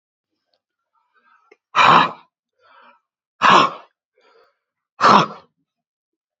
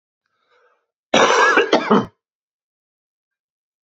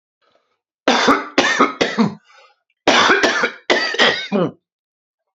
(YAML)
exhalation_length: 6.4 s
exhalation_amplitude: 28762
exhalation_signal_mean_std_ratio: 0.3
cough_length: 3.8 s
cough_amplitude: 29155
cough_signal_mean_std_ratio: 0.37
three_cough_length: 5.4 s
three_cough_amplitude: 32767
three_cough_signal_mean_std_ratio: 0.54
survey_phase: beta (2021-08-13 to 2022-03-07)
age: 45-64
gender: Male
wearing_mask: 'No'
symptom_cough_any: true
symptom_new_continuous_cough: true
symptom_runny_or_blocked_nose: true
symptom_sore_throat: true
symptom_fatigue: true
symptom_fever_high_temperature: true
symptom_headache: true
smoker_status: Ex-smoker
respiratory_condition_asthma: false
respiratory_condition_other: false
recruitment_source: Test and Trace
submission_delay: 2 days
covid_test_result: Positive
covid_test_method: RT-qPCR